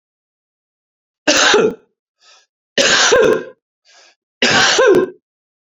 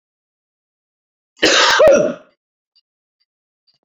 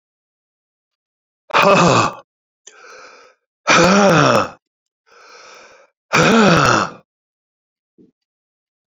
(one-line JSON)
{"three_cough_length": "5.6 s", "three_cough_amplitude": 32728, "three_cough_signal_mean_std_ratio": 0.49, "cough_length": "3.8 s", "cough_amplitude": 32350, "cough_signal_mean_std_ratio": 0.36, "exhalation_length": "9.0 s", "exhalation_amplitude": 32768, "exhalation_signal_mean_std_ratio": 0.41, "survey_phase": "beta (2021-08-13 to 2022-03-07)", "age": "65+", "gender": "Male", "wearing_mask": "Yes", "symptom_cough_any": true, "symptom_runny_or_blocked_nose": true, "symptom_fatigue": true, "symptom_fever_high_temperature": true, "symptom_headache": true, "symptom_loss_of_taste": true, "symptom_onset": "4 days", "smoker_status": "Ex-smoker", "respiratory_condition_asthma": false, "respiratory_condition_other": false, "recruitment_source": "Test and Trace", "submission_delay": "2 days", "covid_test_result": "Positive", "covid_test_method": "RT-qPCR", "covid_ct_value": 15.4, "covid_ct_gene": "ORF1ab gene"}